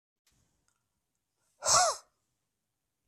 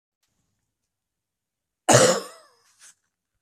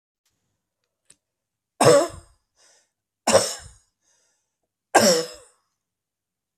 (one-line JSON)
{"exhalation_length": "3.1 s", "exhalation_amplitude": 8679, "exhalation_signal_mean_std_ratio": 0.25, "cough_length": "3.4 s", "cough_amplitude": 27562, "cough_signal_mean_std_ratio": 0.24, "three_cough_length": "6.6 s", "three_cough_amplitude": 26711, "three_cough_signal_mean_std_ratio": 0.27, "survey_phase": "beta (2021-08-13 to 2022-03-07)", "age": "45-64", "gender": "Male", "wearing_mask": "No", "symptom_cough_any": true, "symptom_runny_or_blocked_nose": true, "symptom_shortness_of_breath": true, "symptom_sore_throat": true, "symptom_diarrhoea": true, "symptom_fatigue": true, "symptom_fever_high_temperature": true, "symptom_headache": true, "symptom_change_to_sense_of_smell_or_taste": true, "symptom_loss_of_taste": true, "symptom_onset": "5 days", "smoker_status": "Never smoked", "respiratory_condition_asthma": false, "respiratory_condition_other": false, "recruitment_source": "Test and Trace", "submission_delay": "2 days", "covid_test_result": "Positive", "covid_test_method": "RT-qPCR", "covid_ct_value": 17.6, "covid_ct_gene": "N gene", "covid_ct_mean": 17.8, "covid_viral_load": "1500000 copies/ml", "covid_viral_load_category": "High viral load (>1M copies/ml)"}